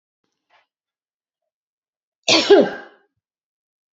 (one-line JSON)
{"cough_length": "3.9 s", "cough_amplitude": 28175, "cough_signal_mean_std_ratio": 0.25, "survey_phase": "beta (2021-08-13 to 2022-03-07)", "age": "65+", "gender": "Female", "wearing_mask": "No", "symptom_cough_any": true, "symptom_runny_or_blocked_nose": true, "symptom_onset": "5 days", "smoker_status": "Ex-smoker", "respiratory_condition_asthma": true, "respiratory_condition_other": false, "recruitment_source": "REACT", "submission_delay": "1 day", "covid_test_result": "Negative", "covid_test_method": "RT-qPCR", "influenza_a_test_result": "Negative", "influenza_b_test_result": "Negative"}